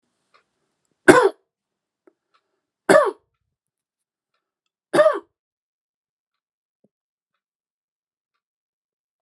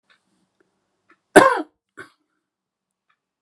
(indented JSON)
{
  "three_cough_length": "9.2 s",
  "three_cough_amplitude": 32768,
  "three_cough_signal_mean_std_ratio": 0.2,
  "cough_length": "3.4 s",
  "cough_amplitude": 32768,
  "cough_signal_mean_std_ratio": 0.18,
  "survey_phase": "beta (2021-08-13 to 2022-03-07)",
  "age": "65+",
  "gender": "Male",
  "wearing_mask": "No",
  "symptom_none": true,
  "smoker_status": "Never smoked",
  "respiratory_condition_asthma": false,
  "respiratory_condition_other": false,
  "recruitment_source": "REACT",
  "submission_delay": "1 day",
  "covid_test_result": "Negative",
  "covid_test_method": "RT-qPCR"
}